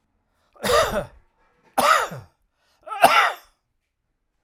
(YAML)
cough_length: 4.4 s
cough_amplitude: 32767
cough_signal_mean_std_ratio: 0.38
survey_phase: alpha (2021-03-01 to 2021-08-12)
age: 65+
gender: Male
wearing_mask: 'No'
symptom_none: true
smoker_status: Ex-smoker
respiratory_condition_asthma: false
respiratory_condition_other: false
recruitment_source: REACT
submission_delay: 5 days
covid_test_result: Negative
covid_test_method: RT-qPCR